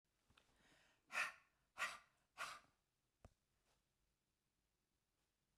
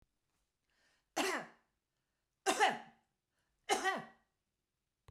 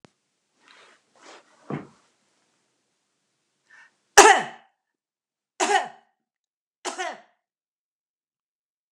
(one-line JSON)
{"exhalation_length": "5.6 s", "exhalation_amplitude": 906, "exhalation_signal_mean_std_ratio": 0.26, "three_cough_length": "5.1 s", "three_cough_amplitude": 5099, "three_cough_signal_mean_std_ratio": 0.32, "cough_length": "8.9 s", "cough_amplitude": 32768, "cough_signal_mean_std_ratio": 0.18, "survey_phase": "beta (2021-08-13 to 2022-03-07)", "age": "65+", "gender": "Female", "wearing_mask": "No", "symptom_none": true, "smoker_status": "Ex-smoker", "respiratory_condition_asthma": false, "respiratory_condition_other": false, "recruitment_source": "REACT", "submission_delay": "1 day", "covid_test_result": "Negative", "covid_test_method": "RT-qPCR", "influenza_a_test_result": "Negative", "influenza_b_test_result": "Negative"}